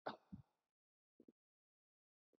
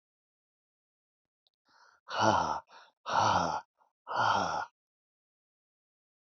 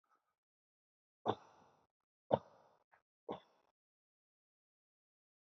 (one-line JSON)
{"cough_length": "2.4 s", "cough_amplitude": 806, "cough_signal_mean_std_ratio": 0.2, "exhalation_length": "6.2 s", "exhalation_amplitude": 9805, "exhalation_signal_mean_std_ratio": 0.4, "three_cough_length": "5.5 s", "three_cough_amplitude": 5008, "three_cough_signal_mean_std_ratio": 0.14, "survey_phase": "beta (2021-08-13 to 2022-03-07)", "age": "45-64", "gender": "Male", "wearing_mask": "No", "symptom_none": true, "smoker_status": "Ex-smoker", "respiratory_condition_asthma": false, "respiratory_condition_other": false, "recruitment_source": "REACT", "submission_delay": "3 days", "covid_test_result": "Negative", "covid_test_method": "RT-qPCR"}